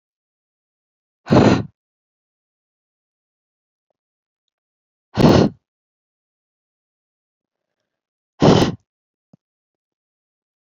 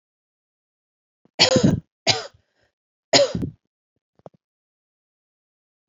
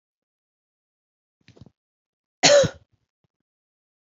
{"exhalation_length": "10.7 s", "exhalation_amplitude": 28925, "exhalation_signal_mean_std_ratio": 0.23, "three_cough_length": "5.9 s", "three_cough_amplitude": 28963, "three_cough_signal_mean_std_ratio": 0.27, "cough_length": "4.2 s", "cough_amplitude": 27278, "cough_signal_mean_std_ratio": 0.21, "survey_phase": "alpha (2021-03-01 to 2021-08-12)", "age": "18-44", "gender": "Female", "wearing_mask": "No", "symptom_none": true, "symptom_onset": "12 days", "smoker_status": "Never smoked", "respiratory_condition_asthma": false, "respiratory_condition_other": false, "recruitment_source": "REACT", "submission_delay": "2 days", "covid_test_result": "Negative", "covid_test_method": "RT-qPCR"}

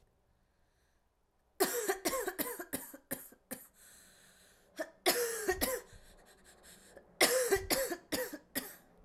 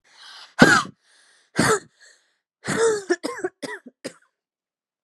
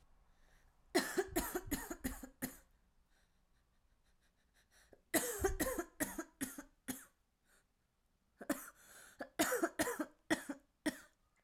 {"cough_length": "9.0 s", "cough_amplitude": 9805, "cough_signal_mean_std_ratio": 0.45, "exhalation_length": "5.0 s", "exhalation_amplitude": 32768, "exhalation_signal_mean_std_ratio": 0.35, "three_cough_length": "11.4 s", "three_cough_amplitude": 4096, "three_cough_signal_mean_std_ratio": 0.4, "survey_phase": "alpha (2021-03-01 to 2021-08-12)", "age": "18-44", "gender": "Female", "wearing_mask": "No", "symptom_cough_any": true, "symptom_new_continuous_cough": true, "symptom_shortness_of_breath": true, "smoker_status": "Ex-smoker", "respiratory_condition_asthma": false, "respiratory_condition_other": false, "recruitment_source": "Test and Trace", "submission_delay": "1 day", "covid_test_result": "Positive", "covid_test_method": "RT-qPCR", "covid_ct_value": 20.5, "covid_ct_gene": "ORF1ab gene", "covid_ct_mean": 21.2, "covid_viral_load": "120000 copies/ml", "covid_viral_load_category": "Low viral load (10K-1M copies/ml)"}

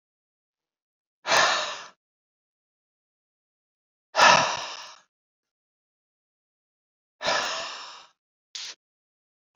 {"exhalation_length": "9.6 s", "exhalation_amplitude": 25957, "exhalation_signal_mean_std_ratio": 0.28, "survey_phase": "alpha (2021-03-01 to 2021-08-12)", "age": "45-64", "gender": "Male", "wearing_mask": "No", "symptom_none": true, "smoker_status": "Never smoked", "respiratory_condition_asthma": false, "respiratory_condition_other": false, "recruitment_source": "REACT", "submission_delay": "3 days", "covid_test_result": "Negative", "covid_test_method": "RT-qPCR"}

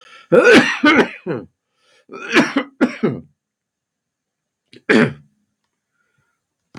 {"three_cough_length": "6.8 s", "three_cough_amplitude": 32768, "three_cough_signal_mean_std_ratio": 0.38, "survey_phase": "beta (2021-08-13 to 2022-03-07)", "age": "45-64", "gender": "Male", "wearing_mask": "No", "symptom_cough_any": true, "symptom_sore_throat": true, "smoker_status": "Ex-smoker", "respiratory_condition_asthma": false, "respiratory_condition_other": false, "recruitment_source": "Test and Trace", "submission_delay": "1 day", "covid_test_result": "Positive", "covid_test_method": "LFT"}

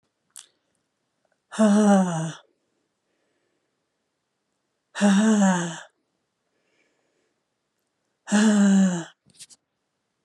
{"exhalation_length": "10.2 s", "exhalation_amplitude": 15211, "exhalation_signal_mean_std_ratio": 0.41, "survey_phase": "alpha (2021-03-01 to 2021-08-12)", "age": "45-64", "gender": "Female", "wearing_mask": "No", "symptom_fatigue": true, "symptom_headache": true, "symptom_change_to_sense_of_smell_or_taste": true, "symptom_loss_of_taste": true, "symptom_onset": "3 days", "smoker_status": "Never smoked", "respiratory_condition_asthma": false, "respiratory_condition_other": false, "recruitment_source": "Test and Trace", "submission_delay": "1 day", "covid_test_result": "Positive", "covid_test_method": "RT-qPCR", "covid_ct_value": 17.0, "covid_ct_gene": "ORF1ab gene", "covid_ct_mean": 17.5, "covid_viral_load": "1900000 copies/ml", "covid_viral_load_category": "High viral load (>1M copies/ml)"}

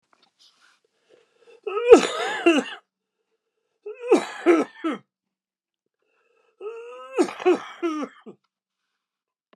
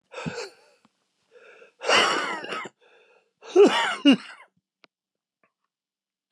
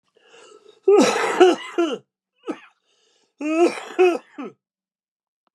{"three_cough_length": "9.6 s", "three_cough_amplitude": 32768, "three_cough_signal_mean_std_ratio": 0.32, "exhalation_length": "6.3 s", "exhalation_amplitude": 17851, "exhalation_signal_mean_std_ratio": 0.34, "cough_length": "5.5 s", "cough_amplitude": 31576, "cough_signal_mean_std_ratio": 0.42, "survey_phase": "beta (2021-08-13 to 2022-03-07)", "age": "45-64", "gender": "Male", "wearing_mask": "No", "symptom_cough_any": true, "symptom_runny_or_blocked_nose": true, "symptom_fatigue": true, "symptom_onset": "6 days", "smoker_status": "Ex-smoker", "respiratory_condition_asthma": true, "respiratory_condition_other": true, "recruitment_source": "Test and Trace", "submission_delay": "2 days", "covid_test_result": "Positive", "covid_test_method": "RT-qPCR", "covid_ct_value": 35.8, "covid_ct_gene": "ORF1ab gene"}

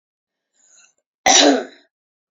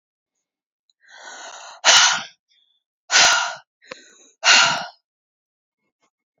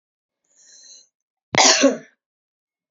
{"three_cough_length": "2.3 s", "three_cough_amplitude": 32768, "three_cough_signal_mean_std_ratio": 0.32, "exhalation_length": "6.4 s", "exhalation_amplitude": 32368, "exhalation_signal_mean_std_ratio": 0.34, "cough_length": "2.9 s", "cough_amplitude": 28747, "cough_signal_mean_std_ratio": 0.29, "survey_phase": "beta (2021-08-13 to 2022-03-07)", "age": "18-44", "gender": "Female", "wearing_mask": "No", "symptom_runny_or_blocked_nose": true, "symptom_fatigue": true, "symptom_onset": "2 days", "smoker_status": "Ex-smoker", "respiratory_condition_asthma": false, "respiratory_condition_other": false, "recruitment_source": "Test and Trace", "submission_delay": "1 day", "covid_test_result": "Positive", "covid_test_method": "RT-qPCR", "covid_ct_value": 19.3, "covid_ct_gene": "ORF1ab gene", "covid_ct_mean": 19.7, "covid_viral_load": "340000 copies/ml", "covid_viral_load_category": "Low viral load (10K-1M copies/ml)"}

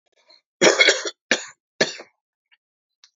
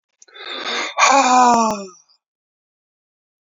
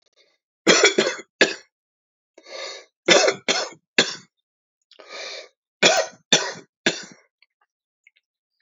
{"cough_length": "3.2 s", "cough_amplitude": 28325, "cough_signal_mean_std_ratio": 0.31, "exhalation_length": "3.4 s", "exhalation_amplitude": 30631, "exhalation_signal_mean_std_ratio": 0.46, "three_cough_length": "8.6 s", "three_cough_amplitude": 31995, "three_cough_signal_mean_std_ratio": 0.34, "survey_phase": "beta (2021-08-13 to 2022-03-07)", "age": "65+", "gender": "Male", "wearing_mask": "No", "symptom_shortness_of_breath": true, "symptom_sore_throat": true, "smoker_status": "Current smoker (1 to 10 cigarettes per day)", "respiratory_condition_asthma": false, "respiratory_condition_other": false, "recruitment_source": "REACT", "submission_delay": "2 days", "covid_test_result": "Negative", "covid_test_method": "RT-qPCR"}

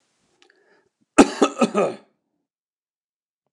{"cough_length": "3.5 s", "cough_amplitude": 29204, "cough_signal_mean_std_ratio": 0.25, "survey_phase": "beta (2021-08-13 to 2022-03-07)", "age": "65+", "gender": "Male", "wearing_mask": "No", "symptom_none": true, "smoker_status": "Ex-smoker", "respiratory_condition_asthma": false, "respiratory_condition_other": false, "recruitment_source": "REACT", "submission_delay": "2 days", "covid_test_result": "Negative", "covid_test_method": "RT-qPCR", "influenza_a_test_result": "Negative", "influenza_b_test_result": "Negative"}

